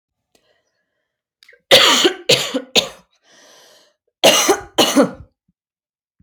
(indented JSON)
{
  "cough_length": "6.2 s",
  "cough_amplitude": 31018,
  "cough_signal_mean_std_ratio": 0.38,
  "survey_phase": "alpha (2021-03-01 to 2021-08-12)",
  "age": "18-44",
  "gender": "Female",
  "wearing_mask": "No",
  "symptom_none": true,
  "smoker_status": "Never smoked",
  "respiratory_condition_asthma": false,
  "respiratory_condition_other": false,
  "recruitment_source": "REACT",
  "submission_delay": "3 days",
  "covid_test_result": "Negative",
  "covid_test_method": "RT-qPCR"
}